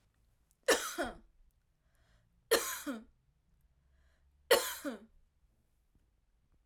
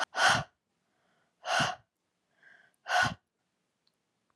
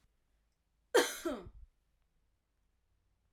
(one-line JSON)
{"three_cough_length": "6.7 s", "three_cough_amplitude": 8281, "three_cough_signal_mean_std_ratio": 0.28, "exhalation_length": "4.4 s", "exhalation_amplitude": 8603, "exhalation_signal_mean_std_ratio": 0.35, "cough_length": "3.3 s", "cough_amplitude": 5715, "cough_signal_mean_std_ratio": 0.24, "survey_phase": "alpha (2021-03-01 to 2021-08-12)", "age": "18-44", "gender": "Female", "wearing_mask": "No", "symptom_cough_any": true, "symptom_fatigue": true, "symptom_fever_high_temperature": true, "symptom_headache": true, "smoker_status": "Never smoked", "respiratory_condition_asthma": false, "respiratory_condition_other": false, "recruitment_source": "Test and Trace", "submission_delay": "2 days", "covid_test_result": "Positive", "covid_test_method": "RT-qPCR"}